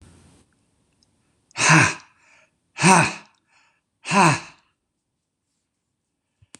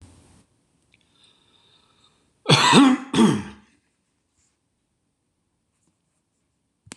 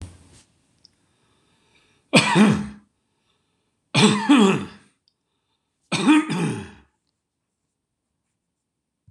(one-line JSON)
{"exhalation_length": "6.6 s", "exhalation_amplitude": 26027, "exhalation_signal_mean_std_ratio": 0.3, "cough_length": "7.0 s", "cough_amplitude": 26027, "cough_signal_mean_std_ratio": 0.27, "three_cough_length": "9.1 s", "three_cough_amplitude": 26027, "three_cough_signal_mean_std_ratio": 0.35, "survey_phase": "beta (2021-08-13 to 2022-03-07)", "age": "65+", "gender": "Male", "wearing_mask": "No", "symptom_none": true, "smoker_status": "Ex-smoker", "respiratory_condition_asthma": true, "respiratory_condition_other": false, "recruitment_source": "REACT", "submission_delay": "1 day", "covid_test_result": "Negative", "covid_test_method": "RT-qPCR"}